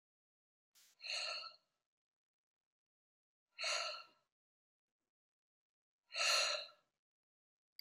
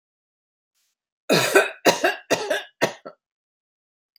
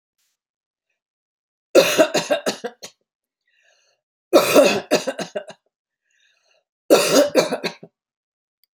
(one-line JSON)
{"exhalation_length": "7.8 s", "exhalation_amplitude": 2656, "exhalation_signal_mean_std_ratio": 0.31, "cough_length": "4.2 s", "cough_amplitude": 26963, "cough_signal_mean_std_ratio": 0.36, "three_cough_length": "8.7 s", "three_cough_amplitude": 31044, "three_cough_signal_mean_std_ratio": 0.36, "survey_phase": "beta (2021-08-13 to 2022-03-07)", "age": "65+", "gender": "Female", "wearing_mask": "No", "symptom_none": true, "smoker_status": "Ex-smoker", "respiratory_condition_asthma": false, "respiratory_condition_other": false, "recruitment_source": "REACT", "submission_delay": "2 days", "covid_test_result": "Negative", "covid_test_method": "RT-qPCR"}